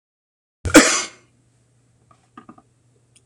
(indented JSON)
{
  "cough_length": "3.3 s",
  "cough_amplitude": 26028,
  "cough_signal_mean_std_ratio": 0.23,
  "survey_phase": "alpha (2021-03-01 to 2021-08-12)",
  "age": "45-64",
  "gender": "Male",
  "wearing_mask": "No",
  "symptom_none": true,
  "smoker_status": "Never smoked",
  "recruitment_source": "REACT",
  "submission_delay": "2 days",
  "covid_test_result": "Negative",
  "covid_test_method": "RT-qPCR"
}